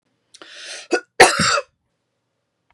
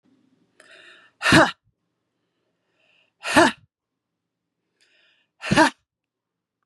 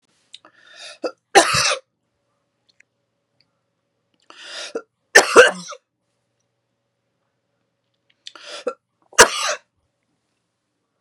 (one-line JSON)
{"cough_length": "2.7 s", "cough_amplitude": 32768, "cough_signal_mean_std_ratio": 0.31, "exhalation_length": "6.7 s", "exhalation_amplitude": 31099, "exhalation_signal_mean_std_ratio": 0.25, "three_cough_length": "11.0 s", "three_cough_amplitude": 32768, "three_cough_signal_mean_std_ratio": 0.23, "survey_phase": "beta (2021-08-13 to 2022-03-07)", "age": "45-64", "gender": "Female", "wearing_mask": "No", "symptom_none": true, "smoker_status": "Never smoked", "respiratory_condition_asthma": false, "respiratory_condition_other": false, "recruitment_source": "REACT", "submission_delay": "2 days", "covid_test_result": "Negative", "covid_test_method": "RT-qPCR", "influenza_a_test_result": "Unknown/Void", "influenza_b_test_result": "Unknown/Void"}